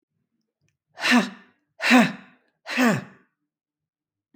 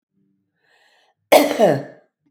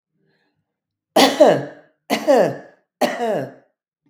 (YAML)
exhalation_length: 4.4 s
exhalation_amplitude: 21104
exhalation_signal_mean_std_ratio: 0.35
cough_length: 2.3 s
cough_amplitude: 32768
cough_signal_mean_std_ratio: 0.33
three_cough_length: 4.1 s
three_cough_amplitude: 32766
three_cough_signal_mean_std_ratio: 0.42
survey_phase: beta (2021-08-13 to 2022-03-07)
age: 65+
gender: Female
wearing_mask: 'No'
symptom_cough_any: true
symptom_fatigue: true
smoker_status: Never smoked
respiratory_condition_asthma: false
respiratory_condition_other: false
recruitment_source: REACT
submission_delay: 2 days
covid_test_result: Negative
covid_test_method: RT-qPCR
influenza_a_test_result: Negative
influenza_b_test_result: Negative